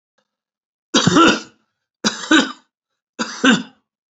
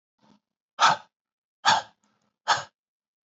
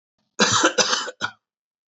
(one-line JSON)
{"three_cough_length": "4.1 s", "three_cough_amplitude": 31142, "three_cough_signal_mean_std_ratio": 0.39, "exhalation_length": "3.2 s", "exhalation_amplitude": 18045, "exhalation_signal_mean_std_ratio": 0.29, "cough_length": "1.9 s", "cough_amplitude": 23617, "cough_signal_mean_std_ratio": 0.47, "survey_phase": "beta (2021-08-13 to 2022-03-07)", "age": "45-64", "gender": "Male", "wearing_mask": "No", "symptom_fatigue": true, "symptom_onset": "12 days", "smoker_status": "Ex-smoker", "respiratory_condition_asthma": true, "respiratory_condition_other": false, "recruitment_source": "REACT", "submission_delay": "0 days", "covid_test_result": "Negative", "covid_test_method": "RT-qPCR", "influenza_a_test_result": "Negative", "influenza_b_test_result": "Negative"}